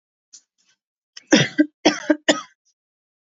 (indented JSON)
{
  "three_cough_length": "3.2 s",
  "three_cough_amplitude": 29829,
  "three_cough_signal_mean_std_ratio": 0.29,
  "survey_phase": "beta (2021-08-13 to 2022-03-07)",
  "age": "18-44",
  "gender": "Female",
  "wearing_mask": "No",
  "symptom_cough_any": true,
  "symptom_sore_throat": true,
  "smoker_status": "Never smoked",
  "respiratory_condition_asthma": false,
  "respiratory_condition_other": false,
  "recruitment_source": "Test and Trace",
  "submission_delay": "2 days",
  "covid_test_result": "Positive",
  "covid_test_method": "RT-qPCR",
  "covid_ct_value": 29.3,
  "covid_ct_gene": "ORF1ab gene"
}